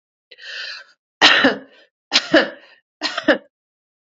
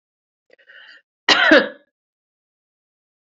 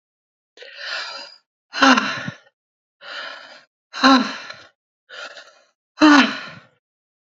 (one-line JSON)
{"three_cough_length": "4.0 s", "three_cough_amplitude": 32069, "three_cough_signal_mean_std_ratio": 0.36, "cough_length": "3.2 s", "cough_amplitude": 32767, "cough_signal_mean_std_ratio": 0.27, "exhalation_length": "7.3 s", "exhalation_amplitude": 29608, "exhalation_signal_mean_std_ratio": 0.33, "survey_phase": "beta (2021-08-13 to 2022-03-07)", "age": "45-64", "gender": "Female", "wearing_mask": "No", "symptom_runny_or_blocked_nose": true, "symptom_diarrhoea": true, "symptom_fatigue": true, "symptom_headache": true, "smoker_status": "Never smoked", "respiratory_condition_asthma": false, "respiratory_condition_other": false, "recruitment_source": "Test and Trace", "submission_delay": "1 day", "covid_test_result": "Positive", "covid_test_method": "RT-qPCR"}